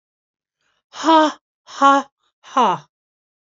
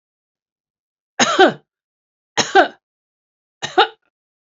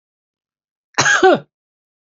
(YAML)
exhalation_length: 3.4 s
exhalation_amplitude: 28291
exhalation_signal_mean_std_ratio: 0.36
three_cough_length: 4.5 s
three_cough_amplitude: 28299
three_cough_signal_mean_std_ratio: 0.29
cough_length: 2.1 s
cough_amplitude: 32768
cough_signal_mean_std_ratio: 0.35
survey_phase: beta (2021-08-13 to 2022-03-07)
age: 65+
gender: Female
wearing_mask: 'No'
symptom_none: true
smoker_status: Never smoked
respiratory_condition_asthma: false
respiratory_condition_other: false
recruitment_source: REACT
submission_delay: 2 days
covid_test_result: Negative
covid_test_method: RT-qPCR
influenza_a_test_result: Negative
influenza_b_test_result: Negative